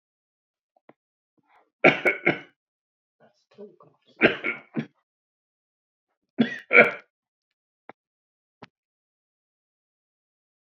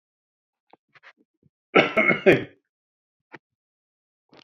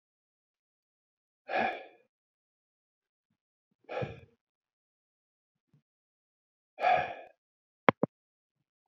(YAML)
three_cough_length: 10.7 s
three_cough_amplitude: 27695
three_cough_signal_mean_std_ratio: 0.21
cough_length: 4.4 s
cough_amplitude: 26531
cough_signal_mean_std_ratio: 0.25
exhalation_length: 8.9 s
exhalation_amplitude: 26297
exhalation_signal_mean_std_ratio: 0.2
survey_phase: beta (2021-08-13 to 2022-03-07)
age: 65+
gender: Male
wearing_mask: 'No'
symptom_none: true
smoker_status: Ex-smoker
respiratory_condition_asthma: false
respiratory_condition_other: false
recruitment_source: REACT
submission_delay: 5 days
covid_test_result: Negative
covid_test_method: RT-qPCR